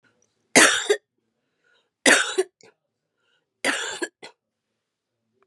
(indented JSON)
{
  "three_cough_length": "5.5 s",
  "three_cough_amplitude": 31614,
  "three_cough_signal_mean_std_ratio": 0.3,
  "survey_phase": "beta (2021-08-13 to 2022-03-07)",
  "age": "45-64",
  "gender": "Female",
  "wearing_mask": "No",
  "symptom_none": true,
  "smoker_status": "Ex-smoker",
  "respiratory_condition_asthma": true,
  "respiratory_condition_other": false,
  "recruitment_source": "REACT",
  "submission_delay": "1 day",
  "covid_test_result": "Negative",
  "covid_test_method": "RT-qPCR",
  "influenza_a_test_result": "Negative",
  "influenza_b_test_result": "Negative"
}